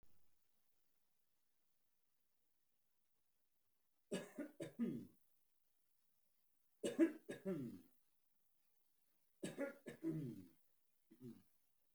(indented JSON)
{
  "three_cough_length": "11.9 s",
  "three_cough_amplitude": 1840,
  "three_cough_signal_mean_std_ratio": 0.32,
  "survey_phase": "beta (2021-08-13 to 2022-03-07)",
  "age": "65+",
  "gender": "Male",
  "wearing_mask": "No",
  "symptom_none": true,
  "smoker_status": "Ex-smoker",
  "respiratory_condition_asthma": false,
  "respiratory_condition_other": false,
  "recruitment_source": "REACT",
  "submission_delay": "1 day",
  "covid_test_result": "Negative",
  "covid_test_method": "RT-qPCR"
}